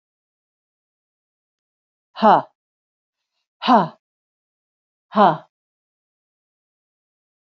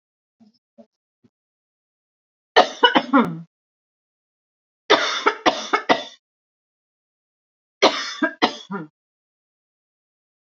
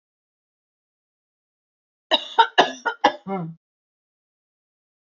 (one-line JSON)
{"exhalation_length": "7.5 s", "exhalation_amplitude": 29279, "exhalation_signal_mean_std_ratio": 0.22, "three_cough_length": "10.5 s", "three_cough_amplitude": 29217, "three_cough_signal_mean_std_ratio": 0.29, "cough_length": "5.1 s", "cough_amplitude": 28235, "cough_signal_mean_std_ratio": 0.24, "survey_phase": "beta (2021-08-13 to 2022-03-07)", "age": "45-64", "gender": "Female", "wearing_mask": "No", "symptom_none": true, "smoker_status": "Never smoked", "respiratory_condition_asthma": false, "respiratory_condition_other": false, "recruitment_source": "REACT", "submission_delay": "2 days", "covid_test_result": "Negative", "covid_test_method": "RT-qPCR", "influenza_a_test_result": "Negative", "influenza_b_test_result": "Negative"}